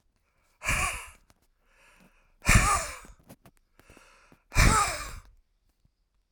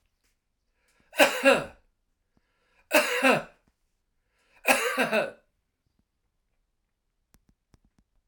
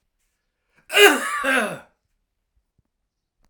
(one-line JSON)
{"exhalation_length": "6.3 s", "exhalation_amplitude": 15880, "exhalation_signal_mean_std_ratio": 0.34, "three_cough_length": "8.3 s", "three_cough_amplitude": 21257, "three_cough_signal_mean_std_ratio": 0.31, "cough_length": "3.5 s", "cough_amplitude": 32732, "cough_signal_mean_std_ratio": 0.32, "survey_phase": "alpha (2021-03-01 to 2021-08-12)", "age": "65+", "gender": "Male", "wearing_mask": "No", "symptom_none": true, "smoker_status": "Ex-smoker", "respiratory_condition_asthma": false, "respiratory_condition_other": false, "recruitment_source": "REACT", "submission_delay": "1 day", "covid_test_result": "Negative", "covid_test_method": "RT-qPCR"}